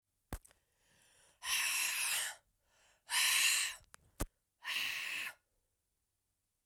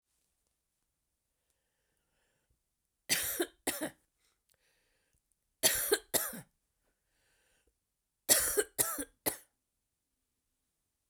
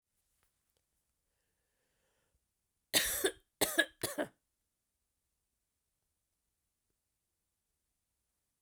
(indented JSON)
{
  "exhalation_length": "6.7 s",
  "exhalation_amplitude": 4016,
  "exhalation_signal_mean_std_ratio": 0.48,
  "three_cough_length": "11.1 s",
  "three_cough_amplitude": 10542,
  "three_cough_signal_mean_std_ratio": 0.28,
  "cough_length": "8.6 s",
  "cough_amplitude": 7202,
  "cough_signal_mean_std_ratio": 0.21,
  "survey_phase": "beta (2021-08-13 to 2022-03-07)",
  "age": "45-64",
  "gender": "Female",
  "wearing_mask": "No",
  "symptom_cough_any": true,
  "symptom_runny_or_blocked_nose": true,
  "symptom_shortness_of_breath": true,
  "symptom_sore_throat": true,
  "symptom_headache": true,
  "smoker_status": "Never smoked",
  "respiratory_condition_asthma": false,
  "respiratory_condition_other": false,
  "recruitment_source": "Test and Trace",
  "submission_delay": "2 days",
  "covid_test_result": "Positive",
  "covid_test_method": "LFT"
}